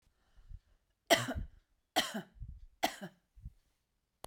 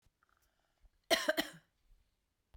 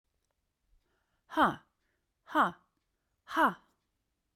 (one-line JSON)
{"three_cough_length": "4.3 s", "three_cough_amplitude": 9054, "three_cough_signal_mean_std_ratio": 0.3, "cough_length": "2.6 s", "cough_amplitude": 5398, "cough_signal_mean_std_ratio": 0.25, "exhalation_length": "4.4 s", "exhalation_amplitude": 6555, "exhalation_signal_mean_std_ratio": 0.28, "survey_phase": "beta (2021-08-13 to 2022-03-07)", "age": "45-64", "gender": "Female", "wearing_mask": "No", "symptom_runny_or_blocked_nose": true, "symptom_sore_throat": true, "symptom_other": true, "symptom_onset": "8 days", "smoker_status": "Never smoked", "respiratory_condition_asthma": false, "respiratory_condition_other": false, "recruitment_source": "REACT", "submission_delay": "1 day", "covid_test_result": "Negative", "covid_test_method": "RT-qPCR"}